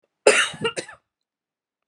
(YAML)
cough_length: 1.9 s
cough_amplitude: 31217
cough_signal_mean_std_ratio: 0.32
survey_phase: beta (2021-08-13 to 2022-03-07)
age: 45-64
gender: Female
wearing_mask: 'No'
symptom_cough_any: true
symptom_new_continuous_cough: true
symptom_runny_or_blocked_nose: true
symptom_shortness_of_breath: true
symptom_abdominal_pain: true
symptom_fatigue: true
symptom_headache: true
symptom_change_to_sense_of_smell_or_taste: true
symptom_loss_of_taste: true
symptom_onset: 4 days
smoker_status: Ex-smoker
respiratory_condition_asthma: false
respiratory_condition_other: false
recruitment_source: Test and Trace
submission_delay: 1 day
covid_test_result: Positive
covid_test_method: RT-qPCR
covid_ct_value: 17.8
covid_ct_gene: ORF1ab gene
covid_ct_mean: 18.3
covid_viral_load: 1000000 copies/ml
covid_viral_load_category: High viral load (>1M copies/ml)